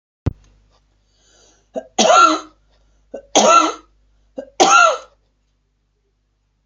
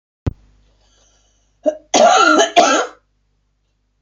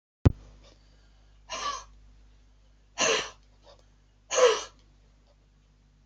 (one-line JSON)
{"three_cough_length": "6.7 s", "three_cough_amplitude": 29789, "three_cough_signal_mean_std_ratio": 0.36, "cough_length": "4.0 s", "cough_amplitude": 31964, "cough_signal_mean_std_ratio": 0.41, "exhalation_length": "6.1 s", "exhalation_amplitude": 19441, "exhalation_signal_mean_std_ratio": 0.28, "survey_phase": "beta (2021-08-13 to 2022-03-07)", "age": "65+", "gender": "Female", "wearing_mask": "No", "symptom_none": true, "symptom_onset": "12 days", "smoker_status": "Never smoked", "respiratory_condition_asthma": false, "respiratory_condition_other": false, "recruitment_source": "REACT", "submission_delay": "1 day", "covid_test_result": "Positive", "covid_test_method": "RT-qPCR", "covid_ct_value": 30.0, "covid_ct_gene": "N gene", "influenza_a_test_result": "Negative", "influenza_b_test_result": "Negative"}